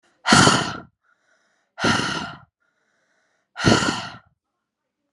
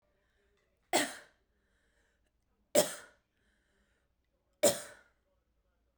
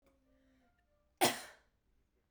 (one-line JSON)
{"exhalation_length": "5.1 s", "exhalation_amplitude": 31204, "exhalation_signal_mean_std_ratio": 0.38, "three_cough_length": "6.0 s", "three_cough_amplitude": 9178, "three_cough_signal_mean_std_ratio": 0.22, "cough_length": "2.3 s", "cough_amplitude": 6737, "cough_signal_mean_std_ratio": 0.21, "survey_phase": "beta (2021-08-13 to 2022-03-07)", "age": "18-44", "gender": "Female", "wearing_mask": "No", "symptom_none": true, "smoker_status": "Never smoked", "respiratory_condition_asthma": false, "respiratory_condition_other": false, "recruitment_source": "REACT", "submission_delay": "1 day", "covid_test_result": "Negative", "covid_test_method": "RT-qPCR"}